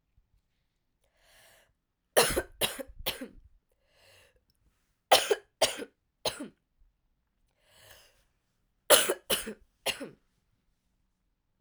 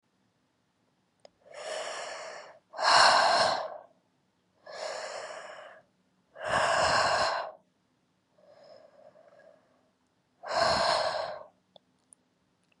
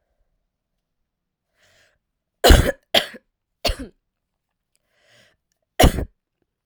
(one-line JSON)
{"three_cough_length": "11.6 s", "three_cough_amplitude": 18146, "three_cough_signal_mean_std_ratio": 0.25, "exhalation_length": "12.8 s", "exhalation_amplitude": 15187, "exhalation_signal_mean_std_ratio": 0.43, "cough_length": "6.7 s", "cough_amplitude": 32768, "cough_signal_mean_std_ratio": 0.22, "survey_phase": "alpha (2021-03-01 to 2021-08-12)", "age": "18-44", "gender": "Female", "wearing_mask": "No", "symptom_cough_any": true, "symptom_shortness_of_breath": true, "symptom_abdominal_pain": true, "symptom_diarrhoea": true, "symptom_fatigue": true, "symptom_headache": true, "symptom_change_to_sense_of_smell_or_taste": true, "symptom_loss_of_taste": true, "smoker_status": "Never smoked", "respiratory_condition_asthma": true, "respiratory_condition_other": false, "recruitment_source": "Test and Trace", "submission_delay": "2 days", "covid_test_result": "Positive", "covid_test_method": "RT-qPCR", "covid_ct_value": 19.8, "covid_ct_gene": "ORF1ab gene"}